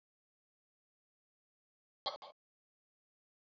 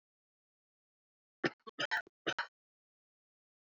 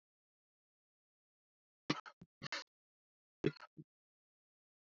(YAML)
exhalation_length: 3.4 s
exhalation_amplitude: 1728
exhalation_signal_mean_std_ratio: 0.14
cough_length: 3.8 s
cough_amplitude: 3434
cough_signal_mean_std_ratio: 0.23
three_cough_length: 4.9 s
three_cough_amplitude: 2991
three_cough_signal_mean_std_ratio: 0.17
survey_phase: alpha (2021-03-01 to 2021-08-12)
age: 18-44
gender: Male
wearing_mask: 'No'
symptom_cough_any: true
symptom_fatigue: true
symptom_fever_high_temperature: true
symptom_headache: true
smoker_status: Never smoked
respiratory_condition_asthma: false
respiratory_condition_other: false
recruitment_source: Test and Trace
submission_delay: 3 days
covid_test_result: Positive
covid_test_method: RT-qPCR